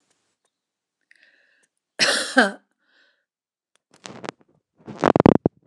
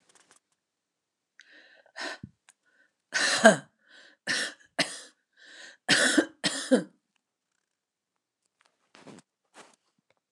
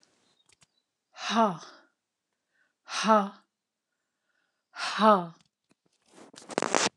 cough_length: 5.7 s
cough_amplitude: 29204
cough_signal_mean_std_ratio: 0.21
three_cough_length: 10.3 s
three_cough_amplitude: 28761
three_cough_signal_mean_std_ratio: 0.27
exhalation_length: 7.0 s
exhalation_amplitude: 15440
exhalation_signal_mean_std_ratio: 0.31
survey_phase: beta (2021-08-13 to 2022-03-07)
age: 65+
gender: Female
wearing_mask: 'No'
symptom_none: true
smoker_status: Never smoked
recruitment_source: REACT
submission_delay: 2 days
covid_test_result: Negative
covid_test_method: RT-qPCR
influenza_a_test_result: Negative
influenza_b_test_result: Negative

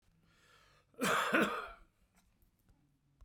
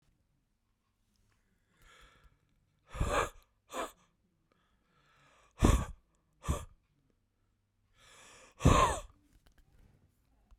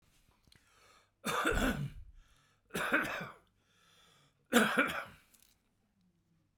cough_length: 3.2 s
cough_amplitude: 4094
cough_signal_mean_std_ratio: 0.37
exhalation_length: 10.6 s
exhalation_amplitude: 9990
exhalation_signal_mean_std_ratio: 0.25
three_cough_length: 6.6 s
three_cough_amplitude: 9562
three_cough_signal_mean_std_ratio: 0.4
survey_phase: beta (2021-08-13 to 2022-03-07)
age: 45-64
gender: Male
wearing_mask: 'No'
symptom_none: true
smoker_status: Current smoker (11 or more cigarettes per day)
respiratory_condition_asthma: true
respiratory_condition_other: false
recruitment_source: REACT
submission_delay: 1 day
covid_test_result: Negative
covid_test_method: RT-qPCR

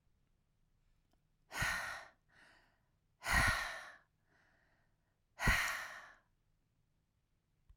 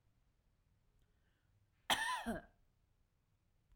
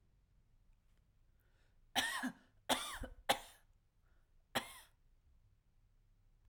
exhalation_length: 7.8 s
exhalation_amplitude: 3906
exhalation_signal_mean_std_ratio: 0.34
cough_length: 3.8 s
cough_amplitude: 3407
cough_signal_mean_std_ratio: 0.29
three_cough_length: 6.5 s
three_cough_amplitude: 5320
three_cough_signal_mean_std_ratio: 0.31
survey_phase: alpha (2021-03-01 to 2021-08-12)
age: 18-44
gender: Female
wearing_mask: 'No'
symptom_none: true
smoker_status: Never smoked
respiratory_condition_asthma: true
respiratory_condition_other: false
recruitment_source: REACT
submission_delay: 1 day
covid_test_result: Negative
covid_test_method: RT-qPCR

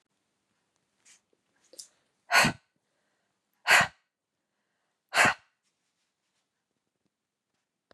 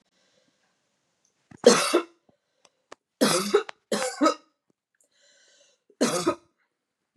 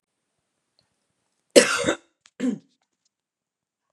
exhalation_length: 7.9 s
exhalation_amplitude: 16918
exhalation_signal_mean_std_ratio: 0.21
three_cough_length: 7.2 s
three_cough_amplitude: 26085
three_cough_signal_mean_std_ratio: 0.32
cough_length: 3.9 s
cough_amplitude: 32751
cough_signal_mean_std_ratio: 0.23
survey_phase: beta (2021-08-13 to 2022-03-07)
age: 18-44
gender: Female
wearing_mask: 'No'
symptom_none: true
smoker_status: Ex-smoker
respiratory_condition_asthma: false
respiratory_condition_other: false
recruitment_source: REACT
submission_delay: 1 day
covid_test_result: Positive
covid_test_method: RT-qPCR
covid_ct_value: 36.0
covid_ct_gene: N gene
influenza_a_test_result: Negative
influenza_b_test_result: Negative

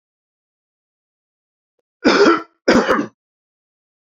cough_length: 4.2 s
cough_amplitude: 31310
cough_signal_mean_std_ratio: 0.33
survey_phase: beta (2021-08-13 to 2022-03-07)
age: 45-64
gender: Male
wearing_mask: 'No'
symptom_new_continuous_cough: true
symptom_abdominal_pain: true
symptom_fatigue: true
symptom_headache: true
symptom_other: true
smoker_status: Never smoked
respiratory_condition_asthma: false
respiratory_condition_other: false
recruitment_source: Test and Trace
submission_delay: 2 days
covid_test_result: Positive
covid_test_method: RT-qPCR
covid_ct_value: 17.7
covid_ct_gene: ORF1ab gene
covid_ct_mean: 18.5
covid_viral_load: 860000 copies/ml
covid_viral_load_category: Low viral load (10K-1M copies/ml)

